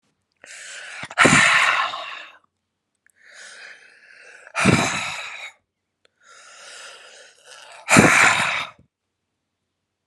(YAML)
exhalation_length: 10.1 s
exhalation_amplitude: 32768
exhalation_signal_mean_std_ratio: 0.39
survey_phase: alpha (2021-03-01 to 2021-08-12)
age: 45-64
gender: Female
wearing_mask: 'No'
symptom_none: true
smoker_status: Current smoker (11 or more cigarettes per day)
respiratory_condition_asthma: false
respiratory_condition_other: false
recruitment_source: REACT
submission_delay: 1 day
covid_test_result: Negative
covid_test_method: RT-qPCR